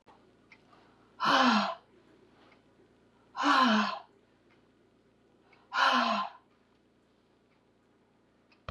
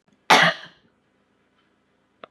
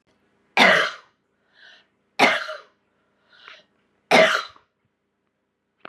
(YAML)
exhalation_length: 8.7 s
exhalation_amplitude: 7947
exhalation_signal_mean_std_ratio: 0.37
cough_length: 2.3 s
cough_amplitude: 32100
cough_signal_mean_std_ratio: 0.26
three_cough_length: 5.9 s
three_cough_amplitude: 32562
three_cough_signal_mean_std_ratio: 0.31
survey_phase: beta (2021-08-13 to 2022-03-07)
age: 45-64
gender: Female
wearing_mask: 'No'
symptom_cough_any: true
symptom_new_continuous_cough: true
symptom_runny_or_blocked_nose: true
symptom_sore_throat: true
symptom_abdominal_pain: true
symptom_fatigue: true
symptom_fever_high_temperature: true
symptom_headache: true
symptom_change_to_sense_of_smell_or_taste: true
symptom_loss_of_taste: true
symptom_onset: 2 days
smoker_status: Never smoked
respiratory_condition_asthma: false
respiratory_condition_other: false
recruitment_source: Test and Trace
submission_delay: 1 day
covid_test_result: Positive
covid_test_method: RT-qPCR